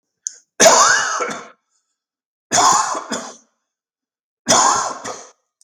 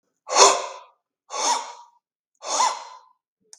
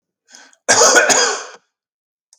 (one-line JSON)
{"three_cough_length": "5.6 s", "three_cough_amplitude": 32768, "three_cough_signal_mean_std_ratio": 0.45, "exhalation_length": "3.6 s", "exhalation_amplitude": 32766, "exhalation_signal_mean_std_ratio": 0.38, "cough_length": "2.4 s", "cough_amplitude": 32768, "cough_signal_mean_std_ratio": 0.46, "survey_phase": "beta (2021-08-13 to 2022-03-07)", "age": "45-64", "gender": "Male", "wearing_mask": "No", "symptom_none": true, "smoker_status": "Never smoked", "respiratory_condition_asthma": false, "respiratory_condition_other": false, "recruitment_source": "REACT", "submission_delay": "1 day", "covid_test_result": "Positive", "covid_test_method": "RT-qPCR", "covid_ct_value": 30.0, "covid_ct_gene": "N gene", "influenza_a_test_result": "Negative", "influenza_b_test_result": "Negative"}